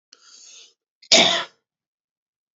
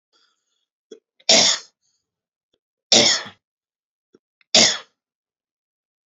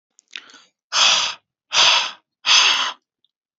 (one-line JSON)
{"cough_length": "2.6 s", "cough_amplitude": 32047, "cough_signal_mean_std_ratio": 0.27, "three_cough_length": "6.1 s", "three_cough_amplitude": 32768, "three_cough_signal_mean_std_ratio": 0.28, "exhalation_length": "3.6 s", "exhalation_amplitude": 32352, "exhalation_signal_mean_std_ratio": 0.48, "survey_phase": "beta (2021-08-13 to 2022-03-07)", "age": "18-44", "gender": "Male", "wearing_mask": "No", "symptom_cough_any": true, "symptom_runny_or_blocked_nose": true, "symptom_fatigue": true, "symptom_fever_high_temperature": true, "symptom_onset": "2 days", "smoker_status": "Never smoked", "respiratory_condition_asthma": false, "respiratory_condition_other": false, "recruitment_source": "Test and Trace", "submission_delay": "1 day", "covid_test_result": "Positive", "covid_test_method": "RT-qPCR", "covid_ct_value": 21.2, "covid_ct_gene": "ORF1ab gene", "covid_ct_mean": 21.6, "covid_viral_load": "85000 copies/ml", "covid_viral_load_category": "Low viral load (10K-1M copies/ml)"}